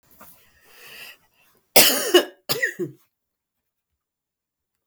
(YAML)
cough_length: 4.9 s
cough_amplitude: 32768
cough_signal_mean_std_ratio: 0.27
survey_phase: beta (2021-08-13 to 2022-03-07)
age: 65+
gender: Female
wearing_mask: 'No'
symptom_runny_or_blocked_nose: true
symptom_onset: 3 days
smoker_status: Never smoked
respiratory_condition_asthma: false
respiratory_condition_other: false
recruitment_source: Test and Trace
submission_delay: 1 day
covid_test_result: Positive
covid_test_method: RT-qPCR
covid_ct_value: 26.8
covid_ct_gene: ORF1ab gene